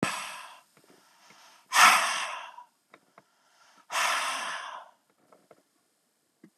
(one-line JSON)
{"exhalation_length": "6.6 s", "exhalation_amplitude": 21654, "exhalation_signal_mean_std_ratio": 0.34, "survey_phase": "beta (2021-08-13 to 2022-03-07)", "age": "45-64", "gender": "Male", "wearing_mask": "No", "symptom_cough_any": true, "symptom_diarrhoea": true, "symptom_onset": "2 days", "smoker_status": "Current smoker (1 to 10 cigarettes per day)", "respiratory_condition_asthma": false, "respiratory_condition_other": false, "recruitment_source": "REACT", "submission_delay": "1 day", "covid_test_result": "Negative", "covid_test_method": "RT-qPCR", "influenza_a_test_result": "Negative", "influenza_b_test_result": "Negative"}